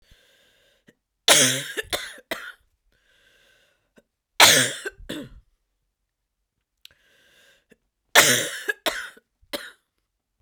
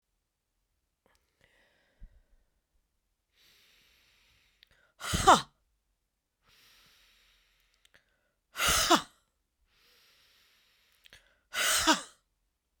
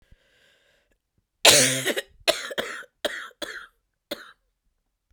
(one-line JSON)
{"three_cough_length": "10.4 s", "three_cough_amplitude": 32768, "three_cough_signal_mean_std_ratio": 0.28, "exhalation_length": "12.8 s", "exhalation_amplitude": 14861, "exhalation_signal_mean_std_ratio": 0.22, "cough_length": "5.1 s", "cough_amplitude": 32767, "cough_signal_mean_std_ratio": 0.3, "survey_phase": "beta (2021-08-13 to 2022-03-07)", "age": "45-64", "gender": "Female", "wearing_mask": "No", "symptom_cough_any": true, "symptom_fatigue": true, "symptom_headache": true, "symptom_change_to_sense_of_smell_or_taste": true, "symptom_loss_of_taste": true, "symptom_other": true, "symptom_onset": "8 days", "smoker_status": "Never smoked", "respiratory_condition_asthma": false, "respiratory_condition_other": false, "recruitment_source": "Test and Trace", "submission_delay": "2 days", "covid_test_result": "Positive", "covid_test_method": "ePCR"}